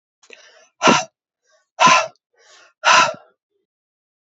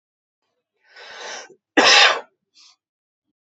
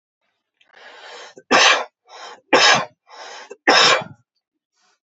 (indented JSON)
{
  "exhalation_length": "4.4 s",
  "exhalation_amplitude": 31065,
  "exhalation_signal_mean_std_ratio": 0.33,
  "cough_length": "3.5 s",
  "cough_amplitude": 32438,
  "cough_signal_mean_std_ratio": 0.3,
  "three_cough_length": "5.1 s",
  "three_cough_amplitude": 32768,
  "three_cough_signal_mean_std_ratio": 0.38,
  "survey_phase": "beta (2021-08-13 to 2022-03-07)",
  "age": "45-64",
  "gender": "Male",
  "wearing_mask": "No",
  "symptom_sore_throat": true,
  "symptom_fatigue": true,
  "symptom_onset": "12 days",
  "smoker_status": "Ex-smoker",
  "respiratory_condition_asthma": false,
  "respiratory_condition_other": false,
  "recruitment_source": "REACT",
  "submission_delay": "2 days",
  "covid_test_result": "Negative",
  "covid_test_method": "RT-qPCR",
  "influenza_a_test_result": "Negative",
  "influenza_b_test_result": "Negative"
}